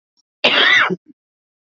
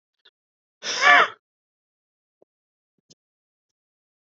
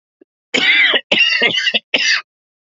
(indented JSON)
{
  "cough_length": "1.7 s",
  "cough_amplitude": 28353,
  "cough_signal_mean_std_ratio": 0.46,
  "exhalation_length": "4.4 s",
  "exhalation_amplitude": 31489,
  "exhalation_signal_mean_std_ratio": 0.21,
  "three_cough_length": "2.7 s",
  "three_cough_amplitude": 30288,
  "three_cough_signal_mean_std_ratio": 0.63,
  "survey_phase": "beta (2021-08-13 to 2022-03-07)",
  "age": "45-64",
  "gender": "Male",
  "wearing_mask": "No",
  "symptom_cough_any": true,
  "symptom_runny_or_blocked_nose": true,
  "symptom_sore_throat": true,
  "symptom_fatigue": true,
  "symptom_fever_high_temperature": true,
  "symptom_headache": true,
  "symptom_onset": "2 days",
  "smoker_status": "Never smoked",
  "respiratory_condition_asthma": false,
  "respiratory_condition_other": false,
  "recruitment_source": "Test and Trace",
  "submission_delay": "1 day",
  "covid_test_result": "Positive",
  "covid_test_method": "RT-qPCR",
  "covid_ct_value": 16.5,
  "covid_ct_gene": "ORF1ab gene",
  "covid_ct_mean": 17.5,
  "covid_viral_load": "1800000 copies/ml",
  "covid_viral_load_category": "High viral load (>1M copies/ml)"
}